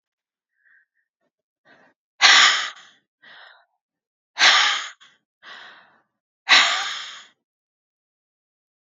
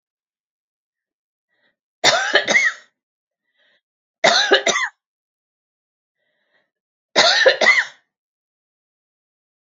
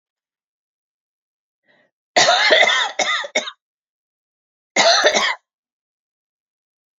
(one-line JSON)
{"exhalation_length": "8.9 s", "exhalation_amplitude": 32768, "exhalation_signal_mean_std_ratio": 0.3, "three_cough_length": "9.6 s", "three_cough_amplitude": 31737, "three_cough_signal_mean_std_ratio": 0.34, "cough_length": "7.0 s", "cough_amplitude": 32767, "cough_signal_mean_std_ratio": 0.39, "survey_phase": "alpha (2021-03-01 to 2021-08-12)", "age": "45-64", "gender": "Female", "wearing_mask": "No", "symptom_none": true, "smoker_status": "Never smoked", "respiratory_condition_asthma": false, "respiratory_condition_other": false, "recruitment_source": "REACT", "submission_delay": "2 days", "covid_test_result": "Negative", "covid_test_method": "RT-qPCR"}